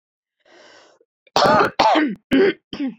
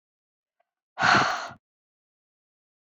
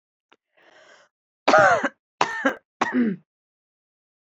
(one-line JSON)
{"cough_length": "3.0 s", "cough_amplitude": 27324, "cough_signal_mean_std_ratio": 0.51, "exhalation_length": "2.8 s", "exhalation_amplitude": 16774, "exhalation_signal_mean_std_ratio": 0.3, "three_cough_length": "4.3 s", "three_cough_amplitude": 32767, "three_cough_signal_mean_std_ratio": 0.35, "survey_phase": "beta (2021-08-13 to 2022-03-07)", "age": "18-44", "gender": "Female", "wearing_mask": "No", "symptom_cough_any": true, "symptom_onset": "12 days", "smoker_status": "Never smoked", "respiratory_condition_asthma": false, "respiratory_condition_other": false, "recruitment_source": "REACT", "submission_delay": "5 days", "covid_test_result": "Negative", "covid_test_method": "RT-qPCR", "influenza_a_test_result": "Negative", "influenza_b_test_result": "Negative"}